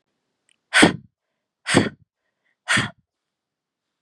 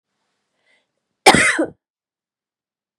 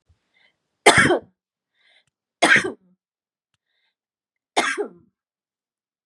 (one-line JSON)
{"exhalation_length": "4.0 s", "exhalation_amplitude": 32767, "exhalation_signal_mean_std_ratio": 0.28, "cough_length": "3.0 s", "cough_amplitude": 32768, "cough_signal_mean_std_ratio": 0.26, "three_cough_length": "6.1 s", "three_cough_amplitude": 32768, "three_cough_signal_mean_std_ratio": 0.27, "survey_phase": "beta (2021-08-13 to 2022-03-07)", "age": "45-64", "gender": "Female", "wearing_mask": "No", "symptom_cough_any": true, "symptom_runny_or_blocked_nose": true, "symptom_shortness_of_breath": true, "symptom_sore_throat": true, "symptom_headache": true, "symptom_onset": "7 days", "smoker_status": "Never smoked", "respiratory_condition_asthma": false, "respiratory_condition_other": false, "recruitment_source": "Test and Trace", "submission_delay": "1 day", "covid_test_result": "Positive", "covid_test_method": "ePCR"}